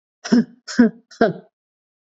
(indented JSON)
{
  "exhalation_length": "2.0 s",
  "exhalation_amplitude": 27878,
  "exhalation_signal_mean_std_ratio": 0.35,
  "survey_phase": "beta (2021-08-13 to 2022-03-07)",
  "age": "45-64",
  "gender": "Female",
  "wearing_mask": "No",
  "symptom_cough_any": true,
  "symptom_runny_or_blocked_nose": true,
  "symptom_shortness_of_breath": true,
  "symptom_fatigue": true,
  "symptom_headache": true,
  "symptom_change_to_sense_of_smell_or_taste": true,
  "symptom_onset": "3 days",
  "smoker_status": "Never smoked",
  "respiratory_condition_asthma": true,
  "respiratory_condition_other": false,
  "recruitment_source": "Test and Trace",
  "submission_delay": "1 day",
  "covid_test_result": "Positive",
  "covid_test_method": "RT-qPCR",
  "covid_ct_value": 18.1,
  "covid_ct_gene": "ORF1ab gene",
  "covid_ct_mean": 18.2,
  "covid_viral_load": "1000000 copies/ml",
  "covid_viral_load_category": "High viral load (>1M copies/ml)"
}